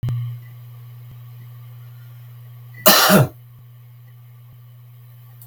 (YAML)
cough_length: 5.5 s
cough_amplitude: 32768
cough_signal_mean_std_ratio: 0.37
survey_phase: beta (2021-08-13 to 2022-03-07)
age: 65+
gender: Male
wearing_mask: 'No'
symptom_none: true
symptom_onset: 8 days
smoker_status: Never smoked
respiratory_condition_asthma: false
respiratory_condition_other: false
recruitment_source: REACT
submission_delay: 2 days
covid_test_result: Negative
covid_test_method: RT-qPCR
influenza_a_test_result: Negative
influenza_b_test_result: Negative